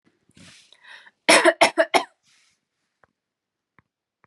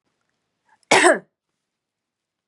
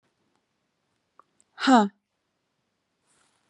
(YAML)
three_cough_length: 4.3 s
three_cough_amplitude: 28832
three_cough_signal_mean_std_ratio: 0.26
cough_length: 2.5 s
cough_amplitude: 31930
cough_signal_mean_std_ratio: 0.26
exhalation_length: 3.5 s
exhalation_amplitude: 17737
exhalation_signal_mean_std_ratio: 0.22
survey_phase: beta (2021-08-13 to 2022-03-07)
age: 18-44
gender: Female
wearing_mask: 'No'
symptom_none: true
smoker_status: Never smoked
respiratory_condition_asthma: false
respiratory_condition_other: false
recruitment_source: REACT
submission_delay: 2 days
covid_test_result: Negative
covid_test_method: RT-qPCR
influenza_a_test_result: Negative
influenza_b_test_result: Negative